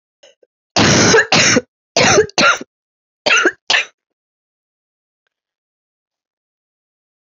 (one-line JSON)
{"cough_length": "7.3 s", "cough_amplitude": 32768, "cough_signal_mean_std_ratio": 0.4, "survey_phase": "beta (2021-08-13 to 2022-03-07)", "age": "18-44", "gender": "Female", "wearing_mask": "Yes", "symptom_cough_any": true, "symptom_runny_or_blocked_nose": true, "symptom_shortness_of_breath": true, "symptom_fatigue": true, "symptom_headache": true, "symptom_other": true, "symptom_onset": "5 days", "smoker_status": "Ex-smoker", "respiratory_condition_asthma": true, "respiratory_condition_other": false, "recruitment_source": "Test and Trace", "submission_delay": "3 days", "covid_test_result": "Positive", "covid_test_method": "RT-qPCR", "covid_ct_value": 24.2, "covid_ct_gene": "N gene"}